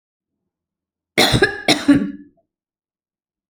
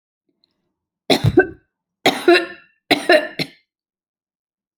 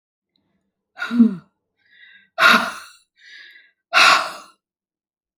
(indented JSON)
{
  "cough_length": "3.5 s",
  "cough_amplitude": 32204,
  "cough_signal_mean_std_ratio": 0.34,
  "three_cough_length": "4.8 s",
  "three_cough_amplitude": 30617,
  "three_cough_signal_mean_std_ratio": 0.33,
  "exhalation_length": "5.4 s",
  "exhalation_amplitude": 29930,
  "exhalation_signal_mean_std_ratio": 0.33,
  "survey_phase": "alpha (2021-03-01 to 2021-08-12)",
  "age": "45-64",
  "gender": "Female",
  "wearing_mask": "No",
  "symptom_none": true,
  "smoker_status": "Never smoked",
  "respiratory_condition_asthma": false,
  "respiratory_condition_other": false,
  "recruitment_source": "REACT",
  "submission_delay": "1 day",
  "covid_test_result": "Negative",
  "covid_test_method": "RT-qPCR"
}